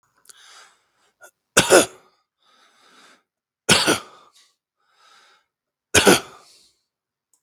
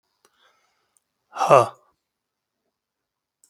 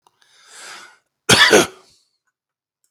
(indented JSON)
{
  "three_cough_length": "7.4 s",
  "three_cough_amplitude": 32766,
  "three_cough_signal_mean_std_ratio": 0.25,
  "exhalation_length": "3.5 s",
  "exhalation_amplitude": 32766,
  "exhalation_signal_mean_std_ratio": 0.19,
  "cough_length": "2.9 s",
  "cough_amplitude": 32768,
  "cough_signal_mean_std_ratio": 0.3,
  "survey_phase": "beta (2021-08-13 to 2022-03-07)",
  "age": "45-64",
  "gender": "Male",
  "wearing_mask": "No",
  "symptom_none": true,
  "smoker_status": "Never smoked",
  "respiratory_condition_asthma": true,
  "respiratory_condition_other": false,
  "recruitment_source": "REACT",
  "submission_delay": "2 days",
  "covid_test_result": "Negative",
  "covid_test_method": "RT-qPCR",
  "influenza_a_test_result": "Negative",
  "influenza_b_test_result": "Negative"
}